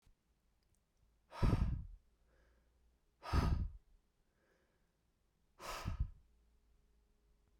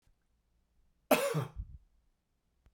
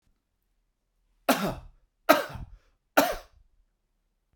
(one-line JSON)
{"exhalation_length": "7.6 s", "exhalation_amplitude": 2589, "exhalation_signal_mean_std_ratio": 0.32, "cough_length": "2.7 s", "cough_amplitude": 7792, "cough_signal_mean_std_ratio": 0.3, "three_cough_length": "4.4 s", "three_cough_amplitude": 24820, "three_cough_signal_mean_std_ratio": 0.27, "survey_phase": "beta (2021-08-13 to 2022-03-07)", "age": "45-64", "gender": "Male", "wearing_mask": "No", "symptom_cough_any": true, "symptom_runny_or_blocked_nose": true, "symptom_sore_throat": true, "symptom_fatigue": true, "symptom_fever_high_temperature": true, "symptom_headache": true, "symptom_onset": "3 days", "smoker_status": "Never smoked", "respiratory_condition_asthma": false, "respiratory_condition_other": false, "recruitment_source": "Test and Trace", "submission_delay": "2 days", "covid_test_result": "Positive", "covid_test_method": "RT-qPCR", "covid_ct_value": 31.7, "covid_ct_gene": "N gene"}